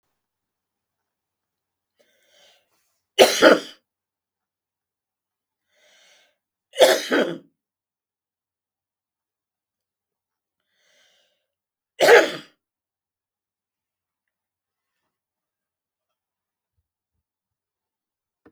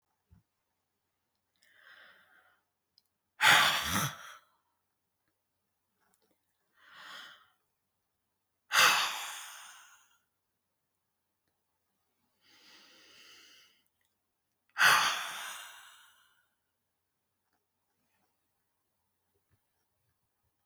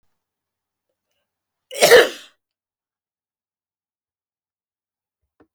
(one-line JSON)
{"three_cough_length": "18.5 s", "three_cough_amplitude": 32768, "three_cough_signal_mean_std_ratio": 0.18, "exhalation_length": "20.7 s", "exhalation_amplitude": 10946, "exhalation_signal_mean_std_ratio": 0.23, "cough_length": "5.5 s", "cough_amplitude": 32768, "cough_signal_mean_std_ratio": 0.18, "survey_phase": "beta (2021-08-13 to 2022-03-07)", "age": "65+", "gender": "Female", "wearing_mask": "No", "symptom_none": true, "smoker_status": "Never smoked", "respiratory_condition_asthma": false, "respiratory_condition_other": false, "recruitment_source": "REACT", "submission_delay": "1 day", "covid_test_result": "Negative", "covid_test_method": "RT-qPCR"}